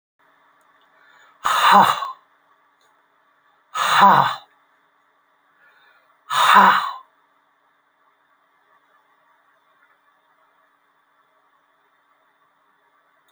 {"exhalation_length": "13.3 s", "exhalation_amplitude": 28740, "exhalation_signal_mean_std_ratio": 0.28, "survey_phase": "alpha (2021-03-01 to 2021-08-12)", "age": "65+", "gender": "Male", "wearing_mask": "No", "symptom_none": true, "smoker_status": "Ex-smoker", "respiratory_condition_asthma": false, "respiratory_condition_other": true, "recruitment_source": "REACT", "submission_delay": "1 day", "covid_test_result": "Negative", "covid_test_method": "RT-qPCR"}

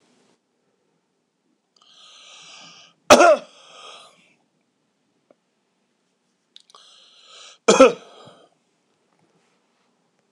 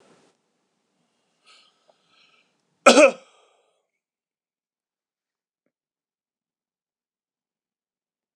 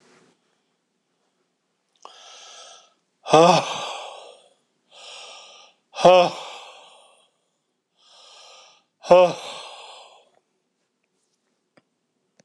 {"cough_length": "10.3 s", "cough_amplitude": 26028, "cough_signal_mean_std_ratio": 0.19, "three_cough_length": "8.4 s", "three_cough_amplitude": 26028, "three_cough_signal_mean_std_ratio": 0.14, "exhalation_length": "12.4 s", "exhalation_amplitude": 26028, "exhalation_signal_mean_std_ratio": 0.24, "survey_phase": "beta (2021-08-13 to 2022-03-07)", "age": "65+", "gender": "Male", "wearing_mask": "No", "symptom_none": true, "smoker_status": "Never smoked", "respiratory_condition_asthma": false, "respiratory_condition_other": false, "recruitment_source": "REACT", "submission_delay": "3 days", "covid_test_result": "Negative", "covid_test_method": "RT-qPCR", "influenza_a_test_result": "Negative", "influenza_b_test_result": "Negative"}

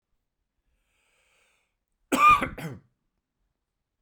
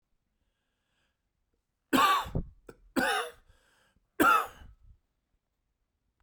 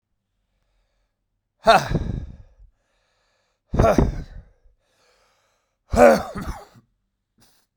{"cough_length": "4.0 s", "cough_amplitude": 13769, "cough_signal_mean_std_ratio": 0.25, "three_cough_length": "6.2 s", "three_cough_amplitude": 10215, "three_cough_signal_mean_std_ratio": 0.33, "exhalation_length": "7.8 s", "exhalation_amplitude": 30680, "exhalation_signal_mean_std_ratio": 0.3, "survey_phase": "beta (2021-08-13 to 2022-03-07)", "age": "45-64", "gender": "Male", "wearing_mask": "No", "symptom_cough_any": true, "symptom_runny_or_blocked_nose": true, "symptom_sore_throat": true, "symptom_diarrhoea": true, "symptom_fever_high_temperature": true, "smoker_status": "Never smoked", "respiratory_condition_asthma": false, "respiratory_condition_other": false, "recruitment_source": "Test and Trace", "submission_delay": "2 days", "covid_test_result": "Positive", "covid_test_method": "RT-qPCR", "covid_ct_value": 24.7, "covid_ct_gene": "S gene", "covid_ct_mean": 25.7, "covid_viral_load": "3900 copies/ml", "covid_viral_load_category": "Minimal viral load (< 10K copies/ml)"}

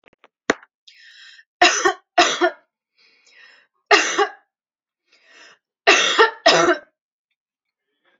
{"three_cough_length": "8.2 s", "three_cough_amplitude": 32767, "three_cough_signal_mean_std_ratio": 0.35, "survey_phase": "beta (2021-08-13 to 2022-03-07)", "age": "18-44", "gender": "Female", "wearing_mask": "No", "symptom_none": true, "smoker_status": "Never smoked", "respiratory_condition_asthma": false, "respiratory_condition_other": false, "recruitment_source": "REACT", "submission_delay": "2 days", "covid_test_result": "Negative", "covid_test_method": "RT-qPCR", "influenza_a_test_result": "Unknown/Void", "influenza_b_test_result": "Unknown/Void"}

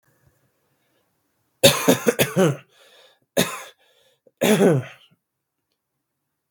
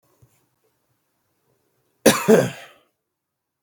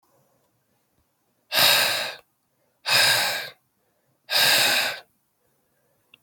{"three_cough_length": "6.5 s", "three_cough_amplitude": 32768, "three_cough_signal_mean_std_ratio": 0.33, "cough_length": "3.6 s", "cough_amplitude": 32767, "cough_signal_mean_std_ratio": 0.24, "exhalation_length": "6.2 s", "exhalation_amplitude": 19340, "exhalation_signal_mean_std_ratio": 0.44, "survey_phase": "beta (2021-08-13 to 2022-03-07)", "age": "18-44", "gender": "Male", "wearing_mask": "No", "symptom_runny_or_blocked_nose": true, "symptom_shortness_of_breath": true, "symptom_headache": true, "symptom_change_to_sense_of_smell_or_taste": true, "symptom_loss_of_taste": true, "symptom_onset": "2 days", "smoker_status": "Never smoked", "respiratory_condition_asthma": false, "respiratory_condition_other": false, "recruitment_source": "Test and Trace", "submission_delay": "2 days", "covid_test_result": "Positive", "covid_test_method": "RT-qPCR", "covid_ct_value": 18.1, "covid_ct_gene": "ORF1ab gene"}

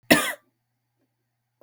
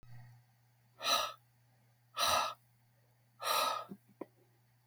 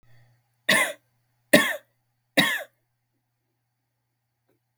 {"cough_length": "1.6 s", "cough_amplitude": 32768, "cough_signal_mean_std_ratio": 0.24, "exhalation_length": "4.9 s", "exhalation_amplitude": 4220, "exhalation_signal_mean_std_ratio": 0.41, "three_cough_length": "4.8 s", "three_cough_amplitude": 32768, "three_cough_signal_mean_std_ratio": 0.27, "survey_phase": "beta (2021-08-13 to 2022-03-07)", "age": "18-44", "gender": "Female", "wearing_mask": "No", "symptom_headache": true, "smoker_status": "Never smoked", "respiratory_condition_asthma": false, "respiratory_condition_other": false, "recruitment_source": "REACT", "submission_delay": "0 days", "covid_test_result": "Negative", "covid_test_method": "RT-qPCR"}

